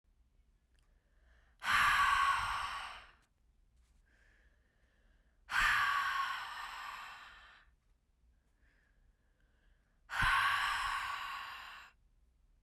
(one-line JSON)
{"exhalation_length": "12.6 s", "exhalation_amplitude": 3882, "exhalation_signal_mean_std_ratio": 0.47, "survey_phase": "beta (2021-08-13 to 2022-03-07)", "age": "18-44", "gender": "Female", "wearing_mask": "No", "symptom_runny_or_blocked_nose": true, "symptom_fever_high_temperature": true, "symptom_headache": true, "symptom_change_to_sense_of_smell_or_taste": true, "symptom_other": true, "symptom_onset": "4 days", "smoker_status": "Never smoked", "respiratory_condition_asthma": false, "respiratory_condition_other": false, "recruitment_source": "Test and Trace", "submission_delay": "2 days", "covid_test_result": "Positive", "covid_test_method": "RT-qPCR", "covid_ct_value": 18.4, "covid_ct_gene": "N gene", "covid_ct_mean": 19.4, "covid_viral_load": "440000 copies/ml", "covid_viral_load_category": "Low viral load (10K-1M copies/ml)"}